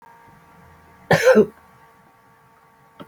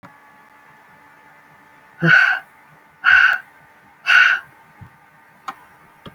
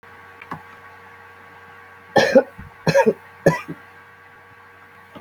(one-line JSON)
{"cough_length": "3.1 s", "cough_amplitude": 24300, "cough_signal_mean_std_ratio": 0.29, "exhalation_length": "6.1 s", "exhalation_amplitude": 28050, "exhalation_signal_mean_std_ratio": 0.36, "three_cough_length": "5.2 s", "three_cough_amplitude": 27964, "three_cough_signal_mean_std_ratio": 0.33, "survey_phase": "beta (2021-08-13 to 2022-03-07)", "age": "45-64", "gender": "Female", "wearing_mask": "No", "symptom_none": true, "smoker_status": "Current smoker (1 to 10 cigarettes per day)", "respiratory_condition_asthma": false, "respiratory_condition_other": false, "recruitment_source": "REACT", "submission_delay": "1 day", "covid_test_result": "Negative", "covid_test_method": "RT-qPCR"}